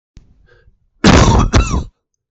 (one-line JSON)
{"cough_length": "2.3 s", "cough_amplitude": 32768, "cough_signal_mean_std_ratio": 0.5, "survey_phase": "beta (2021-08-13 to 2022-03-07)", "age": "45-64", "gender": "Male", "wearing_mask": "No", "symptom_cough_any": true, "symptom_runny_or_blocked_nose": true, "symptom_onset": "12 days", "smoker_status": "Never smoked", "respiratory_condition_asthma": false, "respiratory_condition_other": false, "recruitment_source": "REACT", "submission_delay": "0 days", "covid_test_result": "Negative", "covid_test_method": "RT-qPCR"}